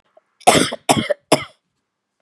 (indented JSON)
{
  "three_cough_length": "2.2 s",
  "three_cough_amplitude": 32768,
  "three_cough_signal_mean_std_ratio": 0.35,
  "survey_phase": "beta (2021-08-13 to 2022-03-07)",
  "age": "45-64",
  "gender": "Female",
  "wearing_mask": "No",
  "symptom_none": true,
  "smoker_status": "Ex-smoker",
  "respiratory_condition_asthma": false,
  "respiratory_condition_other": false,
  "recruitment_source": "Test and Trace",
  "submission_delay": "3 days",
  "covid_test_result": "Negative",
  "covid_test_method": "RT-qPCR"
}